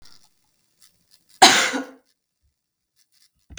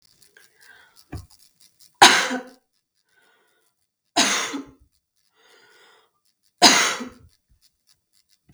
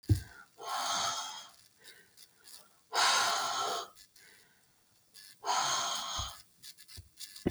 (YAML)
cough_length: 3.6 s
cough_amplitude: 32768
cough_signal_mean_std_ratio: 0.23
three_cough_length: 8.5 s
three_cough_amplitude: 32767
three_cough_signal_mean_std_ratio: 0.25
exhalation_length: 7.5 s
exhalation_amplitude: 5612
exhalation_signal_mean_std_ratio: 0.53
survey_phase: beta (2021-08-13 to 2022-03-07)
age: 18-44
gender: Female
wearing_mask: 'No'
symptom_none: true
smoker_status: Never smoked
respiratory_condition_asthma: true
respiratory_condition_other: false
recruitment_source: REACT
submission_delay: 1 day
covid_test_result: Negative
covid_test_method: RT-qPCR